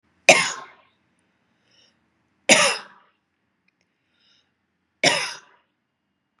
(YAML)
three_cough_length: 6.4 s
three_cough_amplitude: 32768
three_cough_signal_mean_std_ratio: 0.24
survey_phase: beta (2021-08-13 to 2022-03-07)
age: 45-64
gender: Female
wearing_mask: 'No'
symptom_none: true
smoker_status: Ex-smoker
respiratory_condition_asthma: false
respiratory_condition_other: false
recruitment_source: REACT
submission_delay: 1 day
covid_test_result: Negative
covid_test_method: RT-qPCR
influenza_a_test_result: Negative
influenza_b_test_result: Negative